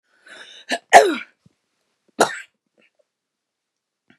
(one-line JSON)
{"cough_length": "4.2 s", "cough_amplitude": 32768, "cough_signal_mean_std_ratio": 0.22, "survey_phase": "beta (2021-08-13 to 2022-03-07)", "age": "65+", "gender": "Female", "wearing_mask": "No", "symptom_cough_any": true, "symptom_runny_or_blocked_nose": true, "symptom_fatigue": true, "smoker_status": "Never smoked", "respiratory_condition_asthma": false, "respiratory_condition_other": true, "recruitment_source": "Test and Trace", "submission_delay": "1 day", "covid_test_result": "Negative", "covid_test_method": "RT-qPCR"}